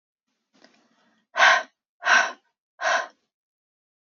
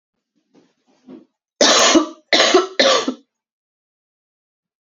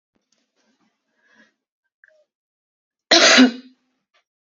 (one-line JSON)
{"exhalation_length": "4.0 s", "exhalation_amplitude": 22740, "exhalation_signal_mean_std_ratio": 0.32, "three_cough_length": "4.9 s", "three_cough_amplitude": 32767, "three_cough_signal_mean_std_ratio": 0.39, "cough_length": "4.5 s", "cough_amplitude": 30780, "cough_signal_mean_std_ratio": 0.24, "survey_phase": "beta (2021-08-13 to 2022-03-07)", "age": "18-44", "gender": "Female", "wearing_mask": "No", "symptom_cough_any": true, "symptom_new_continuous_cough": true, "symptom_runny_or_blocked_nose": true, "symptom_sore_throat": true, "symptom_fatigue": true, "symptom_fever_high_temperature": true, "symptom_change_to_sense_of_smell_or_taste": true, "symptom_loss_of_taste": true, "symptom_other": true, "symptom_onset": "6 days", "smoker_status": "Ex-smoker", "respiratory_condition_asthma": false, "respiratory_condition_other": false, "recruitment_source": "Test and Trace", "submission_delay": "2 days", "covid_test_result": "Negative", "covid_test_method": "RT-qPCR"}